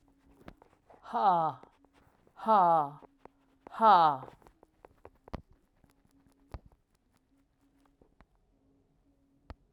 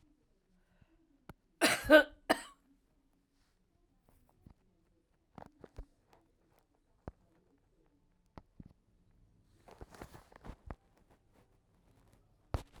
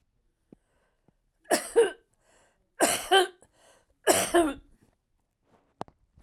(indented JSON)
{
  "exhalation_length": "9.7 s",
  "exhalation_amplitude": 9756,
  "exhalation_signal_mean_std_ratio": 0.29,
  "cough_length": "12.8 s",
  "cough_amplitude": 13463,
  "cough_signal_mean_std_ratio": 0.16,
  "three_cough_length": "6.2 s",
  "three_cough_amplitude": 20328,
  "three_cough_signal_mean_std_ratio": 0.32,
  "survey_phase": "alpha (2021-03-01 to 2021-08-12)",
  "age": "65+",
  "gender": "Female",
  "wearing_mask": "No",
  "symptom_none": true,
  "symptom_cough_any": true,
  "smoker_status": "Never smoked",
  "respiratory_condition_asthma": false,
  "respiratory_condition_other": false,
  "recruitment_source": "REACT",
  "submission_delay": "2 days",
  "covid_test_result": "Negative",
  "covid_test_method": "RT-qPCR"
}